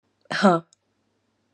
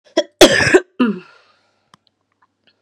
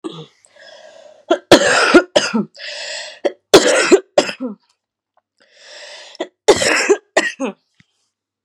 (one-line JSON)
{"exhalation_length": "1.5 s", "exhalation_amplitude": 23958, "exhalation_signal_mean_std_ratio": 0.29, "cough_length": "2.8 s", "cough_amplitude": 32768, "cough_signal_mean_std_ratio": 0.34, "three_cough_length": "8.4 s", "three_cough_amplitude": 32768, "three_cough_signal_mean_std_ratio": 0.4, "survey_phase": "beta (2021-08-13 to 2022-03-07)", "age": "18-44", "gender": "Female", "wearing_mask": "No", "symptom_cough_any": true, "symptom_new_continuous_cough": true, "symptom_runny_or_blocked_nose": true, "symptom_sore_throat": true, "symptom_abdominal_pain": true, "symptom_diarrhoea": true, "symptom_fatigue": true, "symptom_fever_high_temperature": true, "symptom_headache": true, "symptom_change_to_sense_of_smell_or_taste": true, "symptom_loss_of_taste": true, "symptom_onset": "5 days", "smoker_status": "Ex-smoker", "respiratory_condition_asthma": false, "respiratory_condition_other": false, "recruitment_source": "Test and Trace", "submission_delay": "1 day", "covid_test_result": "Positive", "covid_test_method": "RT-qPCR", "covid_ct_value": 17.1, "covid_ct_gene": "ORF1ab gene"}